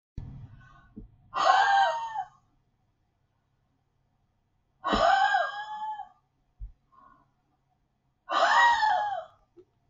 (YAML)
exhalation_length: 9.9 s
exhalation_amplitude: 15483
exhalation_signal_mean_std_ratio: 0.44
survey_phase: beta (2021-08-13 to 2022-03-07)
age: 65+
gender: Female
wearing_mask: 'No'
symptom_none: true
smoker_status: Never smoked
respiratory_condition_asthma: false
respiratory_condition_other: false
recruitment_source: REACT
submission_delay: 2 days
covid_test_result: Negative
covid_test_method: RT-qPCR
influenza_a_test_result: Negative
influenza_b_test_result: Negative